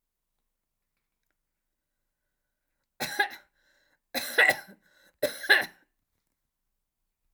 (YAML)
three_cough_length: 7.3 s
three_cough_amplitude: 14281
three_cough_signal_mean_std_ratio: 0.24
survey_phase: alpha (2021-03-01 to 2021-08-12)
age: 65+
gender: Female
wearing_mask: 'No'
symptom_none: true
smoker_status: Never smoked
respiratory_condition_asthma: false
respiratory_condition_other: false
recruitment_source: REACT
submission_delay: 2 days
covid_test_result: Negative
covid_test_method: RT-qPCR